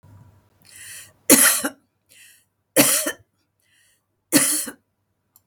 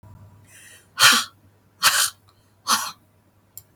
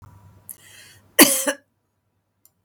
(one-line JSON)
{"three_cough_length": "5.5 s", "three_cough_amplitude": 32768, "three_cough_signal_mean_std_ratio": 0.34, "exhalation_length": "3.8 s", "exhalation_amplitude": 31818, "exhalation_signal_mean_std_ratio": 0.34, "cough_length": "2.6 s", "cough_amplitude": 32768, "cough_signal_mean_std_ratio": 0.24, "survey_phase": "beta (2021-08-13 to 2022-03-07)", "age": "45-64", "gender": "Female", "wearing_mask": "No", "symptom_none": true, "smoker_status": "Never smoked", "respiratory_condition_asthma": false, "respiratory_condition_other": false, "recruitment_source": "REACT", "submission_delay": "2 days", "covid_test_result": "Negative", "covid_test_method": "RT-qPCR", "influenza_a_test_result": "Negative", "influenza_b_test_result": "Negative"}